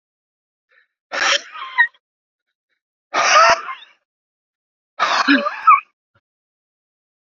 {"exhalation_length": "7.3 s", "exhalation_amplitude": 29537, "exhalation_signal_mean_std_ratio": 0.36, "survey_phase": "beta (2021-08-13 to 2022-03-07)", "age": "45-64", "gender": "Male", "wearing_mask": "No", "symptom_cough_any": true, "symptom_runny_or_blocked_nose": true, "symptom_sore_throat": true, "symptom_fatigue": true, "symptom_headache": true, "symptom_onset": "2 days", "smoker_status": "Ex-smoker", "respiratory_condition_asthma": false, "respiratory_condition_other": false, "recruitment_source": "Test and Trace", "submission_delay": "2 days", "covid_test_result": "Positive", "covid_test_method": "LAMP"}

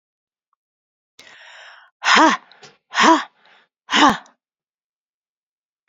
{"exhalation_length": "5.9 s", "exhalation_amplitude": 30444, "exhalation_signal_mean_std_ratio": 0.3, "survey_phase": "beta (2021-08-13 to 2022-03-07)", "age": "65+", "gender": "Female", "wearing_mask": "No", "symptom_cough_any": true, "symptom_runny_or_blocked_nose": true, "symptom_sore_throat": true, "symptom_headache": true, "smoker_status": "Ex-smoker", "respiratory_condition_asthma": false, "respiratory_condition_other": false, "recruitment_source": "Test and Trace", "submission_delay": "1 day", "covid_test_result": "Positive", "covid_test_method": "ePCR"}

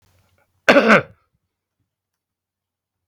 {"cough_length": "3.1 s", "cough_amplitude": 32768, "cough_signal_mean_std_ratio": 0.25, "survey_phase": "beta (2021-08-13 to 2022-03-07)", "age": "65+", "gender": "Male", "wearing_mask": "No", "symptom_none": true, "smoker_status": "Never smoked", "respiratory_condition_asthma": true, "respiratory_condition_other": false, "recruitment_source": "REACT", "submission_delay": "2 days", "covid_test_result": "Negative", "covid_test_method": "RT-qPCR"}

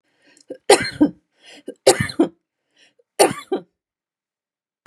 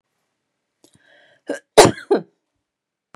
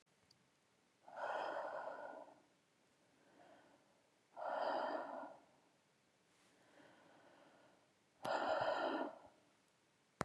{"three_cough_length": "4.9 s", "three_cough_amplitude": 32767, "three_cough_signal_mean_std_ratio": 0.28, "cough_length": "3.2 s", "cough_amplitude": 32768, "cough_signal_mean_std_ratio": 0.21, "exhalation_length": "10.2 s", "exhalation_amplitude": 2759, "exhalation_signal_mean_std_ratio": 0.46, "survey_phase": "beta (2021-08-13 to 2022-03-07)", "age": "45-64", "gender": "Female", "wearing_mask": "No", "symptom_none": true, "smoker_status": "Ex-smoker", "respiratory_condition_asthma": false, "respiratory_condition_other": false, "recruitment_source": "REACT", "submission_delay": "1 day", "covid_test_result": "Negative", "covid_test_method": "RT-qPCR", "influenza_a_test_result": "Negative", "influenza_b_test_result": "Negative"}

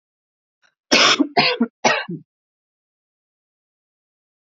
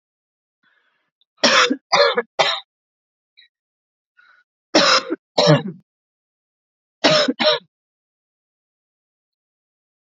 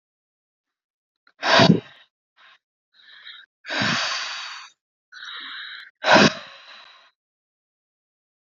{"cough_length": "4.4 s", "cough_amplitude": 31030, "cough_signal_mean_std_ratio": 0.33, "three_cough_length": "10.2 s", "three_cough_amplitude": 32767, "three_cough_signal_mean_std_ratio": 0.33, "exhalation_length": "8.5 s", "exhalation_amplitude": 25744, "exhalation_signal_mean_std_ratio": 0.31, "survey_phase": "alpha (2021-03-01 to 2021-08-12)", "age": "18-44", "gender": "Female", "wearing_mask": "No", "symptom_none": true, "smoker_status": "Never smoked", "respiratory_condition_asthma": false, "respiratory_condition_other": false, "recruitment_source": "REACT", "submission_delay": "1 day", "covid_test_result": "Negative", "covid_test_method": "RT-qPCR"}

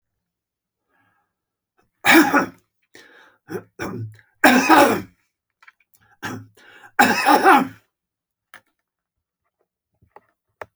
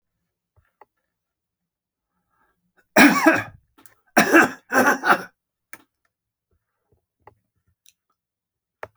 {"three_cough_length": "10.8 s", "three_cough_amplitude": 32768, "three_cough_signal_mean_std_ratio": 0.32, "cough_length": "9.0 s", "cough_amplitude": 32612, "cough_signal_mean_std_ratio": 0.27, "survey_phase": "beta (2021-08-13 to 2022-03-07)", "age": "65+", "gender": "Male", "wearing_mask": "No", "symptom_none": true, "smoker_status": "Ex-smoker", "respiratory_condition_asthma": false, "respiratory_condition_other": false, "recruitment_source": "Test and Trace", "submission_delay": "1 day", "covid_test_result": "Negative", "covid_test_method": "RT-qPCR"}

